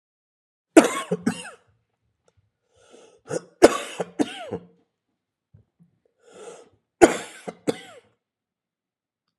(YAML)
three_cough_length: 9.4 s
three_cough_amplitude: 32768
three_cough_signal_mean_std_ratio: 0.21
survey_phase: alpha (2021-03-01 to 2021-08-12)
age: 45-64
gender: Male
wearing_mask: 'No'
symptom_cough_any: true
symptom_new_continuous_cough: true
symptom_fatigue: true
symptom_headache: true
symptom_change_to_sense_of_smell_or_taste: true
symptom_onset: 4 days
smoker_status: Ex-smoker
respiratory_condition_asthma: false
respiratory_condition_other: false
recruitment_source: Test and Trace
submission_delay: 2 days
covid_test_result: Positive
covid_test_method: RT-qPCR
covid_ct_value: 15.8
covid_ct_gene: ORF1ab gene
covid_ct_mean: 16.2
covid_viral_load: 4800000 copies/ml
covid_viral_load_category: High viral load (>1M copies/ml)